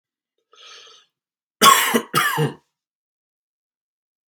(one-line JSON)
{"cough_length": "4.3 s", "cough_amplitude": 32768, "cough_signal_mean_std_ratio": 0.31, "survey_phase": "beta (2021-08-13 to 2022-03-07)", "age": "45-64", "gender": "Male", "wearing_mask": "No", "symptom_cough_any": true, "symptom_runny_or_blocked_nose": true, "symptom_fatigue": true, "symptom_onset": "6 days", "smoker_status": "Never smoked", "respiratory_condition_asthma": false, "respiratory_condition_other": false, "recruitment_source": "Test and Trace", "submission_delay": "1 day", "covid_test_result": "Positive", "covid_test_method": "RT-qPCR", "covid_ct_value": 18.3, "covid_ct_gene": "ORF1ab gene", "covid_ct_mean": 18.8, "covid_viral_load": "690000 copies/ml", "covid_viral_load_category": "Low viral load (10K-1M copies/ml)"}